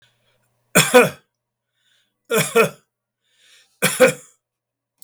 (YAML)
three_cough_length: 5.0 s
three_cough_amplitude: 32766
three_cough_signal_mean_std_ratio: 0.31
survey_phase: beta (2021-08-13 to 2022-03-07)
age: 65+
gender: Male
wearing_mask: 'No'
symptom_none: true
smoker_status: Never smoked
respiratory_condition_asthma: false
respiratory_condition_other: false
recruitment_source: REACT
submission_delay: 3 days
covid_test_result: Negative
covid_test_method: RT-qPCR
influenza_a_test_result: Negative
influenza_b_test_result: Negative